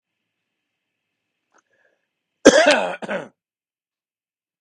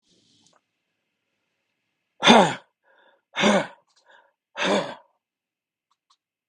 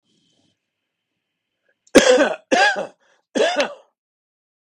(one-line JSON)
{"cough_length": "4.6 s", "cough_amplitude": 32768, "cough_signal_mean_std_ratio": 0.24, "exhalation_length": "6.5 s", "exhalation_amplitude": 32453, "exhalation_signal_mean_std_ratio": 0.26, "three_cough_length": "4.6 s", "three_cough_amplitude": 32768, "three_cough_signal_mean_std_ratio": 0.36, "survey_phase": "beta (2021-08-13 to 2022-03-07)", "age": "65+", "gender": "Male", "wearing_mask": "No", "symptom_none": true, "smoker_status": "Ex-smoker", "respiratory_condition_asthma": false, "respiratory_condition_other": false, "recruitment_source": "REACT", "submission_delay": "3 days", "covid_test_result": "Negative", "covid_test_method": "RT-qPCR", "influenza_a_test_result": "Negative", "influenza_b_test_result": "Negative"}